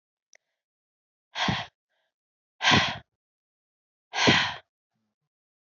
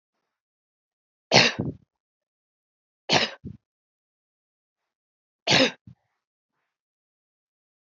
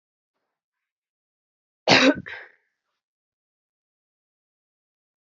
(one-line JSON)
{"exhalation_length": "5.7 s", "exhalation_amplitude": 16662, "exhalation_signal_mean_std_ratio": 0.31, "three_cough_length": "7.9 s", "three_cough_amplitude": 25235, "three_cough_signal_mean_std_ratio": 0.22, "cough_length": "5.3 s", "cough_amplitude": 30505, "cough_signal_mean_std_ratio": 0.19, "survey_phase": "beta (2021-08-13 to 2022-03-07)", "age": "18-44", "gender": "Female", "wearing_mask": "No", "symptom_cough_any": true, "symptom_sore_throat": true, "symptom_fatigue": true, "symptom_headache": true, "symptom_onset": "2 days", "smoker_status": "Never smoked", "respiratory_condition_asthma": false, "respiratory_condition_other": false, "recruitment_source": "Test and Trace", "submission_delay": "2 days", "covid_test_result": "Positive", "covid_test_method": "RT-qPCR", "covid_ct_value": 16.3, "covid_ct_gene": "ORF1ab gene", "covid_ct_mean": 16.5, "covid_viral_load": "3800000 copies/ml", "covid_viral_load_category": "High viral load (>1M copies/ml)"}